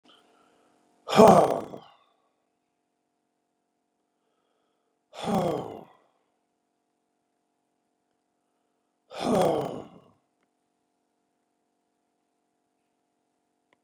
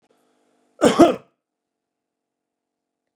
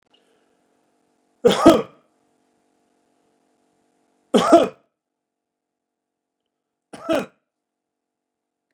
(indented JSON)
{
  "exhalation_length": "13.8 s",
  "exhalation_amplitude": 24924,
  "exhalation_signal_mean_std_ratio": 0.21,
  "cough_length": "3.2 s",
  "cough_amplitude": 32453,
  "cough_signal_mean_std_ratio": 0.21,
  "three_cough_length": "8.7 s",
  "three_cough_amplitude": 32767,
  "three_cough_signal_mean_std_ratio": 0.21,
  "survey_phase": "beta (2021-08-13 to 2022-03-07)",
  "age": "65+",
  "gender": "Male",
  "wearing_mask": "No",
  "symptom_none": true,
  "smoker_status": "Ex-smoker",
  "respiratory_condition_asthma": false,
  "respiratory_condition_other": false,
  "recruitment_source": "REACT",
  "submission_delay": "2 days",
  "covid_test_result": "Negative",
  "covid_test_method": "RT-qPCR",
  "influenza_a_test_result": "Negative",
  "influenza_b_test_result": "Negative"
}